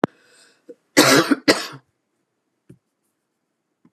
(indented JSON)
{
  "cough_length": "3.9 s",
  "cough_amplitude": 32108,
  "cough_signal_mean_std_ratio": 0.28,
  "survey_phase": "beta (2021-08-13 to 2022-03-07)",
  "age": "65+",
  "gender": "Female",
  "wearing_mask": "No",
  "symptom_none": true,
  "smoker_status": "Ex-smoker",
  "respiratory_condition_asthma": false,
  "respiratory_condition_other": false,
  "recruitment_source": "REACT",
  "submission_delay": "2 days",
  "covid_test_result": "Negative",
  "covid_test_method": "RT-qPCR"
}